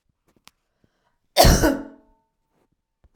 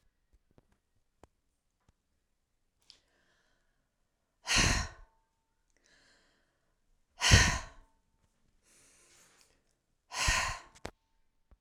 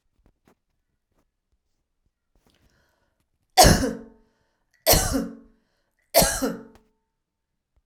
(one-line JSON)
{"cough_length": "3.2 s", "cough_amplitude": 32767, "cough_signal_mean_std_ratio": 0.28, "exhalation_length": "11.6 s", "exhalation_amplitude": 13757, "exhalation_signal_mean_std_ratio": 0.24, "three_cough_length": "7.9 s", "three_cough_amplitude": 32767, "three_cough_signal_mean_std_ratio": 0.27, "survey_phase": "alpha (2021-03-01 to 2021-08-12)", "age": "65+", "gender": "Female", "wearing_mask": "No", "symptom_none": true, "smoker_status": "Never smoked", "respiratory_condition_asthma": false, "respiratory_condition_other": false, "recruitment_source": "REACT", "submission_delay": "3 days", "covid_test_result": "Negative", "covid_test_method": "RT-qPCR"}